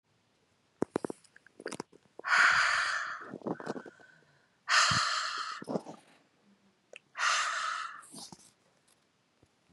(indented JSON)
{
  "exhalation_length": "9.7 s",
  "exhalation_amplitude": 8265,
  "exhalation_signal_mean_std_ratio": 0.44,
  "survey_phase": "beta (2021-08-13 to 2022-03-07)",
  "age": "45-64",
  "gender": "Female",
  "wearing_mask": "No",
  "symptom_cough_any": true,
  "symptom_runny_or_blocked_nose": true,
  "symptom_sore_throat": true,
  "symptom_fatigue": true,
  "symptom_onset": "4 days",
  "smoker_status": "Never smoked",
  "respiratory_condition_asthma": false,
  "respiratory_condition_other": false,
  "recruitment_source": "Test and Trace",
  "submission_delay": "2 days",
  "covid_test_result": "Positive",
  "covid_test_method": "RT-qPCR",
  "covid_ct_value": 14.9,
  "covid_ct_gene": "ORF1ab gene"
}